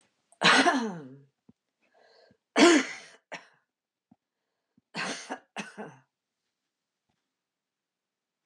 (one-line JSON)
{"three_cough_length": "8.5 s", "three_cough_amplitude": 16415, "three_cough_signal_mean_std_ratio": 0.27, "survey_phase": "beta (2021-08-13 to 2022-03-07)", "age": "65+", "gender": "Female", "wearing_mask": "No", "symptom_runny_or_blocked_nose": true, "smoker_status": "Ex-smoker", "respiratory_condition_asthma": false, "respiratory_condition_other": false, "recruitment_source": "REACT", "submission_delay": "3 days", "covid_test_result": "Negative", "covid_test_method": "RT-qPCR", "influenza_a_test_result": "Negative", "influenza_b_test_result": "Negative"}